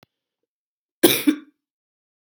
{"cough_length": "2.2 s", "cough_amplitude": 32768, "cough_signal_mean_std_ratio": 0.24, "survey_phase": "beta (2021-08-13 to 2022-03-07)", "age": "45-64", "gender": "Female", "wearing_mask": "No", "symptom_cough_any": true, "symptom_runny_or_blocked_nose": true, "symptom_change_to_sense_of_smell_or_taste": true, "symptom_onset": "3 days", "smoker_status": "Never smoked", "respiratory_condition_asthma": false, "respiratory_condition_other": false, "recruitment_source": "Test and Trace", "submission_delay": "2 days", "covid_test_result": "Positive", "covid_test_method": "RT-qPCR", "covid_ct_value": 15.3, "covid_ct_gene": "N gene", "covid_ct_mean": 16.5, "covid_viral_load": "3800000 copies/ml", "covid_viral_load_category": "High viral load (>1M copies/ml)"}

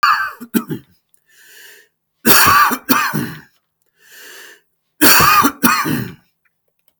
{"three_cough_length": "7.0 s", "three_cough_amplitude": 32768, "three_cough_signal_mean_std_ratio": 0.46, "survey_phase": "beta (2021-08-13 to 2022-03-07)", "age": "45-64", "gender": "Male", "wearing_mask": "No", "symptom_none": true, "smoker_status": "Ex-smoker", "respiratory_condition_asthma": false, "respiratory_condition_other": false, "recruitment_source": "REACT", "submission_delay": "1 day", "covid_test_result": "Negative", "covid_test_method": "RT-qPCR"}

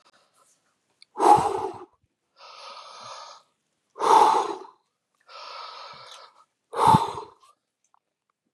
{"exhalation_length": "8.5 s", "exhalation_amplitude": 24642, "exhalation_signal_mean_std_ratio": 0.33, "survey_phase": "beta (2021-08-13 to 2022-03-07)", "age": "45-64", "gender": "Male", "wearing_mask": "No", "symptom_none": true, "smoker_status": "Never smoked", "respiratory_condition_asthma": false, "respiratory_condition_other": false, "recruitment_source": "REACT", "submission_delay": "2 days", "covid_test_result": "Negative", "covid_test_method": "RT-qPCR", "influenza_a_test_result": "Negative", "influenza_b_test_result": "Negative"}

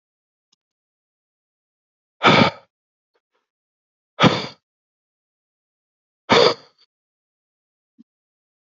{"exhalation_length": "8.6 s", "exhalation_amplitude": 28759, "exhalation_signal_mean_std_ratio": 0.22, "survey_phase": "alpha (2021-03-01 to 2021-08-12)", "age": "18-44", "gender": "Male", "wearing_mask": "No", "symptom_cough_any": true, "symptom_fatigue": true, "symptom_headache": true, "symptom_change_to_sense_of_smell_or_taste": true, "symptom_onset": "4 days", "smoker_status": "Never smoked", "respiratory_condition_asthma": false, "respiratory_condition_other": false, "recruitment_source": "Test and Trace", "submission_delay": "2 days", "covid_test_result": "Positive", "covid_test_method": "RT-qPCR", "covid_ct_value": 17.4, "covid_ct_gene": "N gene", "covid_ct_mean": 17.8, "covid_viral_load": "1500000 copies/ml", "covid_viral_load_category": "High viral load (>1M copies/ml)"}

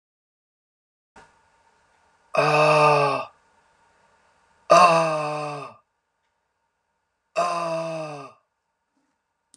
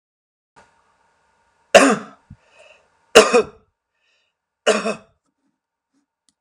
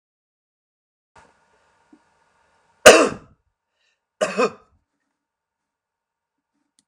{"exhalation_length": "9.6 s", "exhalation_amplitude": 26587, "exhalation_signal_mean_std_ratio": 0.38, "three_cough_length": "6.4 s", "three_cough_amplitude": 32768, "three_cough_signal_mean_std_ratio": 0.24, "cough_length": "6.9 s", "cough_amplitude": 32768, "cough_signal_mean_std_ratio": 0.17, "survey_phase": "alpha (2021-03-01 to 2021-08-12)", "age": "45-64", "gender": "Male", "wearing_mask": "No", "symptom_none": true, "smoker_status": "Never smoked", "respiratory_condition_asthma": false, "respiratory_condition_other": false, "recruitment_source": "REACT", "submission_delay": "1 day", "covid_test_result": "Negative", "covid_test_method": "RT-qPCR"}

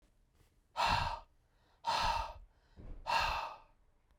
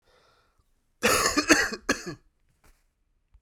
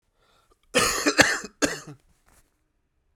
{"exhalation_length": "4.2 s", "exhalation_amplitude": 3367, "exhalation_signal_mean_std_ratio": 0.51, "three_cough_length": "3.4 s", "three_cough_amplitude": 25616, "three_cough_signal_mean_std_ratio": 0.36, "cough_length": "3.2 s", "cough_amplitude": 32768, "cough_signal_mean_std_ratio": 0.35, "survey_phase": "beta (2021-08-13 to 2022-03-07)", "age": "45-64", "gender": "Male", "wearing_mask": "No", "symptom_cough_any": true, "symptom_runny_or_blocked_nose": true, "symptom_fatigue": true, "symptom_headache": true, "symptom_onset": "3 days", "smoker_status": "Never smoked", "respiratory_condition_asthma": false, "respiratory_condition_other": false, "recruitment_source": "Test and Trace", "submission_delay": "2 days", "covid_test_result": "Positive", "covid_test_method": "RT-qPCR", "covid_ct_value": 18.2, "covid_ct_gene": "N gene"}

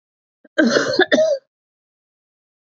{"cough_length": "2.6 s", "cough_amplitude": 27654, "cough_signal_mean_std_ratio": 0.43, "survey_phase": "beta (2021-08-13 to 2022-03-07)", "age": "45-64", "gender": "Female", "wearing_mask": "No", "symptom_cough_any": true, "symptom_runny_or_blocked_nose": true, "symptom_fatigue": true, "symptom_headache": true, "symptom_change_to_sense_of_smell_or_taste": true, "smoker_status": "Ex-smoker", "respiratory_condition_asthma": false, "respiratory_condition_other": false, "recruitment_source": "Test and Trace", "submission_delay": "1 day", "covid_test_result": "Positive", "covid_test_method": "RT-qPCR", "covid_ct_value": 19.7, "covid_ct_gene": "ORF1ab gene", "covid_ct_mean": 20.7, "covid_viral_load": "170000 copies/ml", "covid_viral_load_category": "Low viral load (10K-1M copies/ml)"}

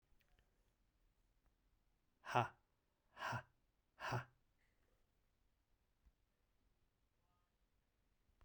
{"exhalation_length": "8.4 s", "exhalation_amplitude": 2371, "exhalation_signal_mean_std_ratio": 0.22, "survey_phase": "beta (2021-08-13 to 2022-03-07)", "age": "45-64", "gender": "Male", "wearing_mask": "No", "symptom_cough_any": true, "symptom_runny_or_blocked_nose": true, "symptom_sore_throat": true, "symptom_fatigue": true, "symptom_headache": true, "smoker_status": "Prefer not to say", "respiratory_condition_asthma": false, "respiratory_condition_other": false, "recruitment_source": "Test and Trace", "submission_delay": "2 days", "covid_test_result": "Positive", "covid_test_method": "RT-qPCR", "covid_ct_value": 22.7, "covid_ct_gene": "ORF1ab gene", "covid_ct_mean": 23.4, "covid_viral_load": "21000 copies/ml", "covid_viral_load_category": "Low viral load (10K-1M copies/ml)"}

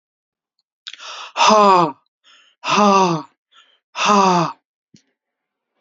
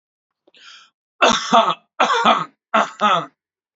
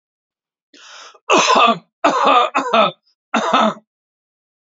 {"exhalation_length": "5.8 s", "exhalation_amplitude": 28855, "exhalation_signal_mean_std_ratio": 0.43, "three_cough_length": "3.8 s", "three_cough_amplitude": 30116, "three_cough_signal_mean_std_ratio": 0.46, "cough_length": "4.7 s", "cough_amplitude": 32767, "cough_signal_mean_std_ratio": 0.49, "survey_phase": "beta (2021-08-13 to 2022-03-07)", "age": "18-44", "gender": "Male", "wearing_mask": "No", "symptom_none": true, "symptom_onset": "7 days", "smoker_status": "Never smoked", "respiratory_condition_asthma": false, "respiratory_condition_other": false, "recruitment_source": "REACT", "submission_delay": "2 days", "covid_test_result": "Negative", "covid_test_method": "RT-qPCR"}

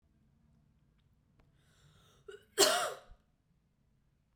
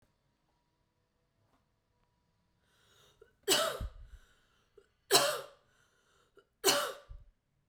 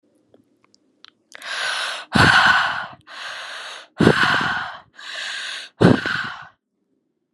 {"cough_length": "4.4 s", "cough_amplitude": 9511, "cough_signal_mean_std_ratio": 0.23, "three_cough_length": "7.7 s", "three_cough_amplitude": 13167, "three_cough_signal_mean_std_ratio": 0.28, "exhalation_length": "7.3 s", "exhalation_amplitude": 32765, "exhalation_signal_mean_std_ratio": 0.47, "survey_phase": "beta (2021-08-13 to 2022-03-07)", "age": "18-44", "gender": "Female", "wearing_mask": "No", "symptom_none": true, "smoker_status": "Never smoked", "respiratory_condition_asthma": false, "respiratory_condition_other": false, "recruitment_source": "REACT", "submission_delay": "9 days", "covid_test_result": "Negative", "covid_test_method": "RT-qPCR"}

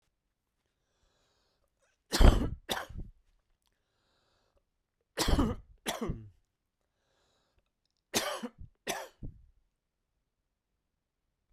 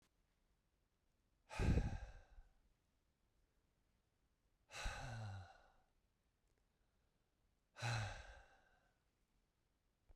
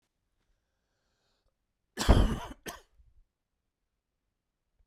{"three_cough_length": "11.5 s", "three_cough_amplitude": 14620, "three_cough_signal_mean_std_ratio": 0.24, "exhalation_length": "10.2 s", "exhalation_amplitude": 1825, "exhalation_signal_mean_std_ratio": 0.31, "cough_length": "4.9 s", "cough_amplitude": 12113, "cough_signal_mean_std_ratio": 0.21, "survey_phase": "beta (2021-08-13 to 2022-03-07)", "age": "45-64", "gender": "Male", "wearing_mask": "No", "symptom_none": true, "smoker_status": "Never smoked", "respiratory_condition_asthma": false, "respiratory_condition_other": false, "recruitment_source": "REACT", "submission_delay": "2 days", "covid_test_result": "Negative", "covid_test_method": "RT-qPCR", "influenza_a_test_result": "Negative", "influenza_b_test_result": "Negative"}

